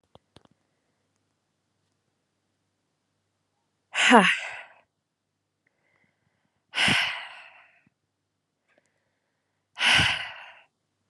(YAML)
exhalation_length: 11.1 s
exhalation_amplitude: 29889
exhalation_signal_mean_std_ratio: 0.26
survey_phase: beta (2021-08-13 to 2022-03-07)
age: 18-44
gender: Female
wearing_mask: 'No'
symptom_other: true
symptom_onset: 9 days
smoker_status: Never smoked
respiratory_condition_asthma: false
respiratory_condition_other: false
recruitment_source: REACT
submission_delay: 1 day
covid_test_result: Negative
covid_test_method: RT-qPCR
influenza_a_test_result: Negative
influenza_b_test_result: Negative